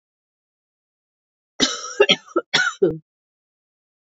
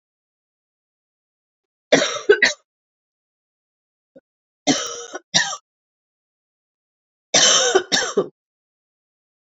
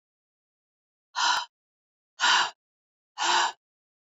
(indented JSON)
{
  "cough_length": "4.0 s",
  "cough_amplitude": 26763,
  "cough_signal_mean_std_ratio": 0.31,
  "three_cough_length": "9.5 s",
  "three_cough_amplitude": 29963,
  "three_cough_signal_mean_std_ratio": 0.31,
  "exhalation_length": "4.2 s",
  "exhalation_amplitude": 11987,
  "exhalation_signal_mean_std_ratio": 0.37,
  "survey_phase": "beta (2021-08-13 to 2022-03-07)",
  "age": "45-64",
  "gender": "Female",
  "wearing_mask": "No",
  "symptom_cough_any": true,
  "symptom_runny_or_blocked_nose": true,
  "symptom_shortness_of_breath": true,
  "symptom_sore_throat": true,
  "symptom_diarrhoea": true,
  "symptom_fever_high_temperature": true,
  "symptom_headache": true,
  "smoker_status": "Never smoked",
  "respiratory_condition_asthma": false,
  "respiratory_condition_other": false,
  "recruitment_source": "Test and Trace",
  "submission_delay": "2 days",
  "covid_test_result": "Positive",
  "covid_test_method": "RT-qPCR",
  "covid_ct_value": 20.1,
  "covid_ct_gene": "ORF1ab gene"
}